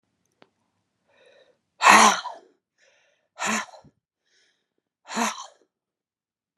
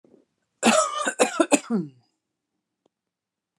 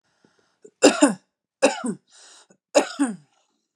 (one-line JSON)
{"exhalation_length": "6.6 s", "exhalation_amplitude": 32082, "exhalation_signal_mean_std_ratio": 0.24, "cough_length": "3.6 s", "cough_amplitude": 20091, "cough_signal_mean_std_ratio": 0.37, "three_cough_length": "3.8 s", "three_cough_amplitude": 32733, "three_cough_signal_mean_std_ratio": 0.32, "survey_phase": "beta (2021-08-13 to 2022-03-07)", "age": "18-44", "gender": "Female", "wearing_mask": "No", "symptom_none": true, "symptom_onset": "11 days", "smoker_status": "Ex-smoker", "respiratory_condition_asthma": true, "respiratory_condition_other": false, "recruitment_source": "REACT", "submission_delay": "1 day", "covid_test_result": "Negative", "covid_test_method": "RT-qPCR", "influenza_a_test_result": "Unknown/Void", "influenza_b_test_result": "Unknown/Void"}